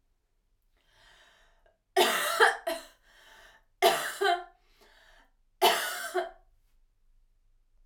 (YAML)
three_cough_length: 7.9 s
three_cough_amplitude: 12723
three_cough_signal_mean_std_ratio: 0.36
survey_phase: beta (2021-08-13 to 2022-03-07)
age: 18-44
gender: Female
wearing_mask: 'No'
symptom_cough_any: true
symptom_runny_or_blocked_nose: true
symptom_sore_throat: true
symptom_fatigue: true
symptom_change_to_sense_of_smell_or_taste: true
symptom_loss_of_taste: true
symptom_onset: 5 days
smoker_status: Never smoked
respiratory_condition_asthma: false
respiratory_condition_other: false
recruitment_source: Test and Trace
submission_delay: 2 days
covid_test_result: Positive
covid_test_method: RT-qPCR
covid_ct_value: 16.0
covid_ct_gene: ORF1ab gene